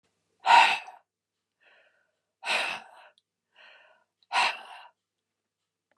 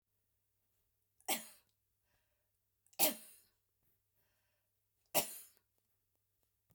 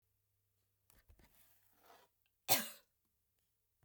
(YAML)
exhalation_length: 6.0 s
exhalation_amplitude: 17453
exhalation_signal_mean_std_ratio: 0.28
three_cough_length: 6.7 s
three_cough_amplitude: 5190
three_cough_signal_mean_std_ratio: 0.2
cough_length: 3.8 s
cough_amplitude: 5410
cough_signal_mean_std_ratio: 0.17
survey_phase: beta (2021-08-13 to 2022-03-07)
age: 65+
gender: Female
wearing_mask: 'No'
symptom_none: true
smoker_status: Never smoked
respiratory_condition_asthma: false
respiratory_condition_other: false
recruitment_source: REACT
submission_delay: 2 days
covid_test_result: Negative
covid_test_method: RT-qPCR